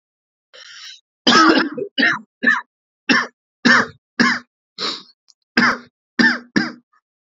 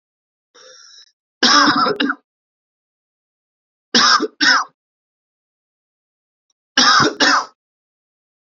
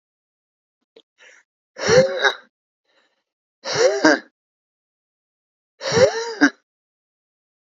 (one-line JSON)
{"cough_length": "7.3 s", "cough_amplitude": 32768, "cough_signal_mean_std_ratio": 0.44, "three_cough_length": "8.5 s", "three_cough_amplitude": 31937, "three_cough_signal_mean_std_ratio": 0.38, "exhalation_length": "7.7 s", "exhalation_amplitude": 32767, "exhalation_signal_mean_std_ratio": 0.33, "survey_phase": "beta (2021-08-13 to 2022-03-07)", "age": "18-44", "gender": "Male", "wearing_mask": "No", "symptom_cough_any": true, "symptom_runny_or_blocked_nose": true, "symptom_shortness_of_breath": true, "symptom_sore_throat": true, "symptom_fatigue": true, "symptom_change_to_sense_of_smell_or_taste": true, "symptom_onset": "2 days", "smoker_status": "Never smoked", "respiratory_condition_asthma": false, "respiratory_condition_other": false, "recruitment_source": "Test and Trace", "submission_delay": "2 days", "covid_test_result": "Positive", "covid_test_method": "RT-qPCR", "covid_ct_value": 25.7, "covid_ct_gene": "ORF1ab gene", "covid_ct_mean": 26.6, "covid_viral_load": "1800 copies/ml", "covid_viral_load_category": "Minimal viral load (< 10K copies/ml)"}